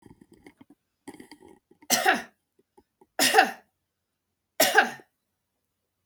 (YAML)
three_cough_length: 6.1 s
three_cough_amplitude: 26312
three_cough_signal_mean_std_ratio: 0.29
survey_phase: beta (2021-08-13 to 2022-03-07)
age: 45-64
gender: Female
wearing_mask: 'No'
symptom_none: true
smoker_status: Never smoked
respiratory_condition_asthma: false
respiratory_condition_other: false
recruitment_source: REACT
submission_delay: 2 days
covid_test_result: Negative
covid_test_method: RT-qPCR